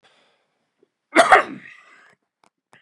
{"cough_length": "2.8 s", "cough_amplitude": 32767, "cough_signal_mean_std_ratio": 0.24, "survey_phase": "beta (2021-08-13 to 2022-03-07)", "age": "45-64", "gender": "Male", "wearing_mask": "No", "symptom_none": true, "smoker_status": "Never smoked", "respiratory_condition_asthma": false, "respiratory_condition_other": false, "recruitment_source": "REACT", "submission_delay": "2 days", "covid_test_result": "Negative", "covid_test_method": "RT-qPCR", "influenza_a_test_result": "Negative", "influenza_b_test_result": "Negative"}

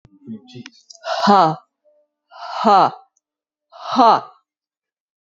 {"exhalation_length": "5.2 s", "exhalation_amplitude": 30228, "exhalation_signal_mean_std_ratio": 0.37, "survey_phase": "beta (2021-08-13 to 2022-03-07)", "age": "18-44", "gender": "Female", "wearing_mask": "No", "symptom_cough_any": true, "symptom_runny_or_blocked_nose": true, "symptom_sore_throat": true, "symptom_fatigue": true, "symptom_fever_high_temperature": true, "symptom_onset": "2 days", "smoker_status": "Never smoked", "respiratory_condition_asthma": false, "respiratory_condition_other": false, "recruitment_source": "Test and Trace", "submission_delay": "1 day", "covid_test_result": "Negative", "covid_test_method": "ePCR"}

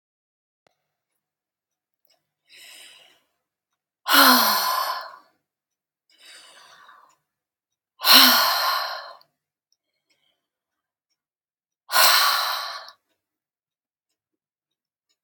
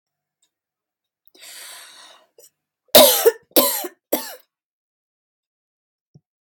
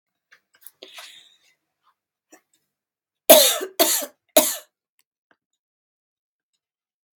{"exhalation_length": "15.2 s", "exhalation_amplitude": 31834, "exhalation_signal_mean_std_ratio": 0.31, "cough_length": "6.4 s", "cough_amplitude": 32768, "cough_signal_mean_std_ratio": 0.25, "three_cough_length": "7.2 s", "three_cough_amplitude": 32768, "three_cough_signal_mean_std_ratio": 0.22, "survey_phase": "beta (2021-08-13 to 2022-03-07)", "age": "65+", "gender": "Female", "wearing_mask": "No", "symptom_none": true, "smoker_status": "Ex-smoker", "respiratory_condition_asthma": false, "respiratory_condition_other": true, "recruitment_source": "REACT", "submission_delay": "1 day", "covid_test_result": "Negative", "covid_test_method": "RT-qPCR"}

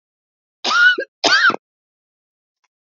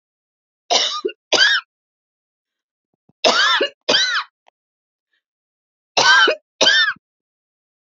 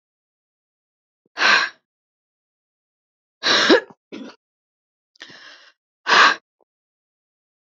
{"cough_length": "2.8 s", "cough_amplitude": 31188, "cough_signal_mean_std_ratio": 0.41, "three_cough_length": "7.9 s", "three_cough_amplitude": 29656, "three_cough_signal_mean_std_ratio": 0.42, "exhalation_length": "7.8 s", "exhalation_amplitude": 28292, "exhalation_signal_mean_std_ratio": 0.28, "survey_phase": "beta (2021-08-13 to 2022-03-07)", "age": "45-64", "gender": "Female", "wearing_mask": "No", "symptom_sore_throat": true, "symptom_fatigue": true, "smoker_status": "Never smoked", "respiratory_condition_asthma": false, "respiratory_condition_other": false, "recruitment_source": "REACT", "submission_delay": "1 day", "covid_test_result": "Negative", "covid_test_method": "RT-qPCR", "influenza_a_test_result": "Negative", "influenza_b_test_result": "Negative"}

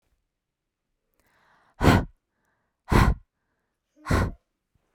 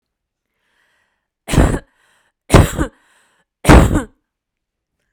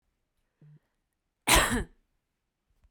{"exhalation_length": "4.9 s", "exhalation_amplitude": 22069, "exhalation_signal_mean_std_ratio": 0.29, "three_cough_length": "5.1 s", "three_cough_amplitude": 32768, "three_cough_signal_mean_std_ratio": 0.31, "cough_length": "2.9 s", "cough_amplitude": 15106, "cough_signal_mean_std_ratio": 0.27, "survey_phase": "beta (2021-08-13 to 2022-03-07)", "age": "18-44", "gender": "Female", "wearing_mask": "No", "symptom_none": true, "symptom_onset": "8 days", "smoker_status": "Never smoked", "respiratory_condition_asthma": false, "respiratory_condition_other": false, "recruitment_source": "REACT", "submission_delay": "13 days", "covid_test_result": "Negative", "covid_test_method": "RT-qPCR"}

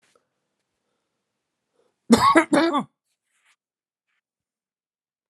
{"cough_length": "5.3 s", "cough_amplitude": 31203, "cough_signal_mean_std_ratio": 0.26, "survey_phase": "alpha (2021-03-01 to 2021-08-12)", "age": "45-64", "gender": "Male", "wearing_mask": "No", "symptom_none": true, "smoker_status": "Never smoked", "respiratory_condition_asthma": true, "respiratory_condition_other": false, "recruitment_source": "REACT", "submission_delay": "1 day", "covid_test_result": "Negative", "covid_test_method": "RT-qPCR"}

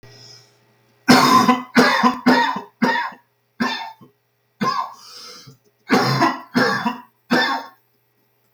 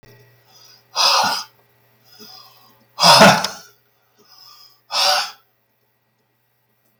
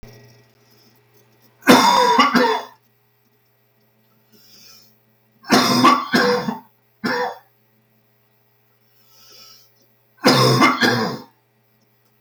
{"cough_length": "8.5 s", "cough_amplitude": 32768, "cough_signal_mean_std_ratio": 0.51, "exhalation_length": "7.0 s", "exhalation_amplitude": 32768, "exhalation_signal_mean_std_ratio": 0.33, "three_cough_length": "12.2 s", "three_cough_amplitude": 32768, "three_cough_signal_mean_std_ratio": 0.41, "survey_phase": "beta (2021-08-13 to 2022-03-07)", "age": "45-64", "gender": "Male", "wearing_mask": "No", "symptom_cough_any": true, "symptom_runny_or_blocked_nose": true, "symptom_fatigue": true, "symptom_headache": true, "symptom_onset": "3 days", "smoker_status": "Never smoked", "respiratory_condition_asthma": false, "respiratory_condition_other": false, "recruitment_source": "Test and Trace", "submission_delay": "1 day", "covid_test_result": "Positive", "covid_test_method": "LAMP"}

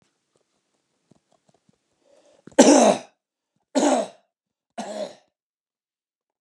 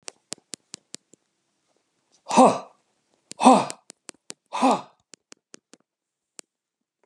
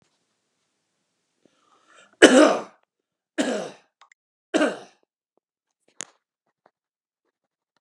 {"cough_length": "6.4 s", "cough_amplitude": 31701, "cough_signal_mean_std_ratio": 0.27, "exhalation_length": "7.1 s", "exhalation_amplitude": 29245, "exhalation_signal_mean_std_ratio": 0.24, "three_cough_length": "7.8 s", "three_cough_amplitude": 32768, "three_cough_signal_mean_std_ratio": 0.22, "survey_phase": "beta (2021-08-13 to 2022-03-07)", "age": "45-64", "gender": "Male", "wearing_mask": "No", "symptom_none": true, "smoker_status": "Ex-smoker", "respiratory_condition_asthma": false, "respiratory_condition_other": false, "recruitment_source": "REACT", "submission_delay": "7 days", "covid_test_result": "Negative", "covid_test_method": "RT-qPCR", "influenza_a_test_result": "Negative", "influenza_b_test_result": "Negative"}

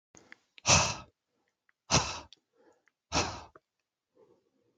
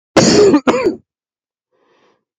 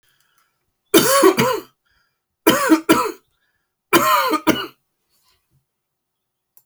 {"exhalation_length": "4.8 s", "exhalation_amplitude": 10882, "exhalation_signal_mean_std_ratio": 0.29, "cough_length": "2.4 s", "cough_amplitude": 30675, "cough_signal_mean_std_ratio": 0.47, "three_cough_length": "6.7 s", "three_cough_amplitude": 32768, "three_cough_signal_mean_std_ratio": 0.41, "survey_phase": "alpha (2021-03-01 to 2021-08-12)", "age": "45-64", "gender": "Male", "wearing_mask": "No", "symptom_none": true, "smoker_status": "Never smoked", "respiratory_condition_asthma": true, "respiratory_condition_other": false, "recruitment_source": "REACT", "submission_delay": "2 days", "covid_test_result": "Negative", "covid_test_method": "RT-qPCR"}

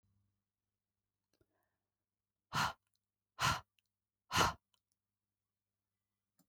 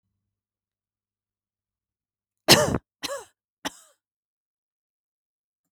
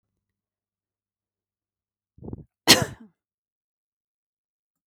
{"exhalation_length": "6.5 s", "exhalation_amplitude": 4325, "exhalation_signal_mean_std_ratio": 0.23, "three_cough_length": "5.7 s", "three_cough_amplitude": 32768, "three_cough_signal_mean_std_ratio": 0.18, "cough_length": "4.9 s", "cough_amplitude": 32768, "cough_signal_mean_std_ratio": 0.14, "survey_phase": "beta (2021-08-13 to 2022-03-07)", "age": "45-64", "gender": "Female", "wearing_mask": "No", "symptom_none": true, "smoker_status": "Never smoked", "respiratory_condition_asthma": false, "respiratory_condition_other": false, "recruitment_source": "REACT", "submission_delay": "1 day", "covid_test_result": "Negative", "covid_test_method": "RT-qPCR"}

